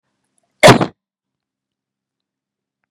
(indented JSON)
{
  "cough_length": "2.9 s",
  "cough_amplitude": 32768,
  "cough_signal_mean_std_ratio": 0.2,
  "survey_phase": "beta (2021-08-13 to 2022-03-07)",
  "age": "45-64",
  "gender": "Female",
  "wearing_mask": "No",
  "symptom_none": true,
  "smoker_status": "Ex-smoker",
  "respiratory_condition_asthma": false,
  "respiratory_condition_other": false,
  "recruitment_source": "REACT",
  "submission_delay": "2 days",
  "covid_test_result": "Negative",
  "covid_test_method": "RT-qPCR",
  "influenza_a_test_result": "Negative",
  "influenza_b_test_result": "Negative"
}